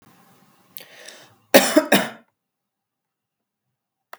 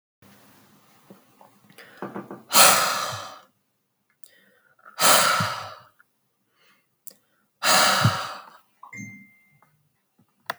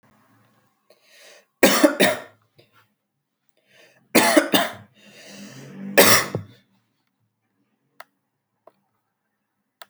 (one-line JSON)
{"cough_length": "4.2 s", "cough_amplitude": 32768, "cough_signal_mean_std_ratio": 0.23, "exhalation_length": "10.6 s", "exhalation_amplitude": 32768, "exhalation_signal_mean_std_ratio": 0.34, "three_cough_length": "9.9 s", "three_cough_amplitude": 32768, "three_cough_signal_mean_std_ratio": 0.28, "survey_phase": "beta (2021-08-13 to 2022-03-07)", "age": "18-44", "gender": "Male", "wearing_mask": "No", "symptom_none": true, "smoker_status": "Never smoked", "respiratory_condition_asthma": false, "respiratory_condition_other": false, "recruitment_source": "REACT", "submission_delay": "1 day", "covid_test_result": "Negative", "covid_test_method": "RT-qPCR", "covid_ct_value": 44.0, "covid_ct_gene": "N gene"}